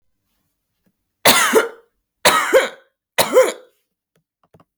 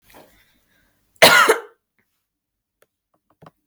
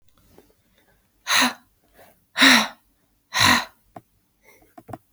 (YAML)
three_cough_length: 4.8 s
three_cough_amplitude: 32768
three_cough_signal_mean_std_ratio: 0.38
cough_length: 3.7 s
cough_amplitude: 32768
cough_signal_mean_std_ratio: 0.25
exhalation_length: 5.1 s
exhalation_amplitude: 29837
exhalation_signal_mean_std_ratio: 0.32
survey_phase: beta (2021-08-13 to 2022-03-07)
age: 18-44
gender: Female
wearing_mask: 'No'
symptom_none: true
smoker_status: Never smoked
respiratory_condition_asthma: false
respiratory_condition_other: false
recruitment_source: REACT
submission_delay: 0 days
covid_test_result: Negative
covid_test_method: RT-qPCR